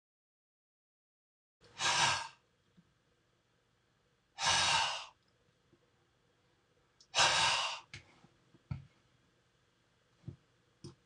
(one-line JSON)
{"exhalation_length": "11.1 s", "exhalation_amplitude": 6650, "exhalation_signal_mean_std_ratio": 0.33, "survey_phase": "beta (2021-08-13 to 2022-03-07)", "age": "45-64", "gender": "Male", "wearing_mask": "No", "symptom_sore_throat": true, "smoker_status": "Never smoked", "respiratory_condition_asthma": false, "respiratory_condition_other": false, "recruitment_source": "REACT", "submission_delay": "3 days", "covid_test_result": "Negative", "covid_test_method": "RT-qPCR"}